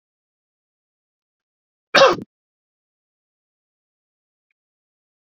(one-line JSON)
{"cough_length": "5.4 s", "cough_amplitude": 28840, "cough_signal_mean_std_ratio": 0.15, "survey_phase": "beta (2021-08-13 to 2022-03-07)", "age": "45-64", "gender": "Male", "wearing_mask": "No", "symptom_none": true, "smoker_status": "Never smoked", "respiratory_condition_asthma": false, "respiratory_condition_other": false, "recruitment_source": "REACT", "submission_delay": "2 days", "covid_test_result": "Negative", "covid_test_method": "RT-qPCR"}